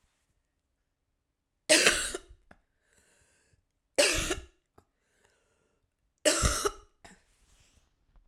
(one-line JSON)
{"three_cough_length": "8.3 s", "three_cough_amplitude": 24261, "three_cough_signal_mean_std_ratio": 0.29, "survey_phase": "beta (2021-08-13 to 2022-03-07)", "age": "45-64", "gender": "Female", "wearing_mask": "No", "symptom_cough_any": true, "symptom_new_continuous_cough": true, "symptom_runny_or_blocked_nose": true, "symptom_shortness_of_breath": true, "symptom_sore_throat": true, "symptom_fatigue": true, "symptom_headache": true, "symptom_change_to_sense_of_smell_or_taste": true, "symptom_loss_of_taste": true, "symptom_other": true, "symptom_onset": "3 days", "smoker_status": "Ex-smoker", "respiratory_condition_asthma": false, "respiratory_condition_other": false, "recruitment_source": "Test and Trace", "submission_delay": "2 days", "covid_test_result": "Positive", "covid_test_method": "RT-qPCR", "covid_ct_value": 20.2, "covid_ct_gene": "ORF1ab gene"}